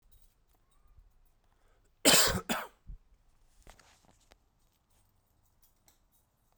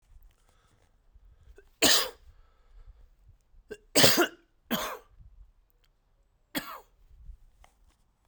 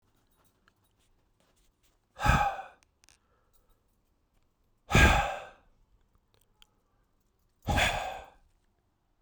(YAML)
cough_length: 6.6 s
cough_amplitude: 12150
cough_signal_mean_std_ratio: 0.22
three_cough_length: 8.3 s
three_cough_amplitude: 17540
three_cough_signal_mean_std_ratio: 0.27
exhalation_length: 9.2 s
exhalation_amplitude: 11754
exhalation_signal_mean_std_ratio: 0.28
survey_phase: beta (2021-08-13 to 2022-03-07)
age: 45-64
gender: Male
wearing_mask: 'No'
symptom_cough_any: true
symptom_runny_or_blocked_nose: true
symptom_shortness_of_breath: true
symptom_sore_throat: true
symptom_diarrhoea: true
symptom_fatigue: true
symptom_fever_high_temperature: true
symptom_headache: true
symptom_change_to_sense_of_smell_or_taste: true
symptom_onset: 7 days
smoker_status: Never smoked
respiratory_condition_asthma: false
respiratory_condition_other: false
recruitment_source: Test and Trace
submission_delay: 2 days
covid_test_result: Positive
covid_test_method: RT-qPCR
covid_ct_value: 20.3
covid_ct_gene: ORF1ab gene
covid_ct_mean: 20.8
covid_viral_load: 160000 copies/ml
covid_viral_load_category: Low viral load (10K-1M copies/ml)